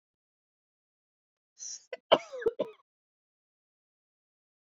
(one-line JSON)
{"cough_length": "4.8 s", "cough_amplitude": 15536, "cough_signal_mean_std_ratio": 0.17, "survey_phase": "beta (2021-08-13 to 2022-03-07)", "age": "45-64", "gender": "Female", "wearing_mask": "No", "symptom_cough_any": true, "smoker_status": "Ex-smoker", "respiratory_condition_asthma": false, "respiratory_condition_other": false, "recruitment_source": "REACT", "submission_delay": "1 day", "covid_test_result": "Negative", "covid_test_method": "RT-qPCR"}